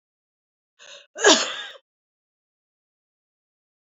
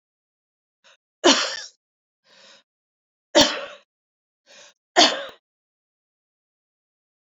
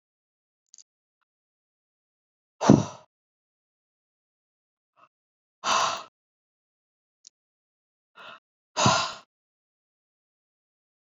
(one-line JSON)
{"cough_length": "3.8 s", "cough_amplitude": 26713, "cough_signal_mean_std_ratio": 0.21, "three_cough_length": "7.3 s", "three_cough_amplitude": 28519, "three_cough_signal_mean_std_ratio": 0.23, "exhalation_length": "11.0 s", "exhalation_amplitude": 26494, "exhalation_signal_mean_std_ratio": 0.2, "survey_phase": "beta (2021-08-13 to 2022-03-07)", "age": "45-64", "gender": "Female", "wearing_mask": "No", "symptom_none": true, "smoker_status": "Never smoked", "respiratory_condition_asthma": false, "respiratory_condition_other": false, "recruitment_source": "REACT", "submission_delay": "1 day", "covid_test_result": "Negative", "covid_test_method": "RT-qPCR"}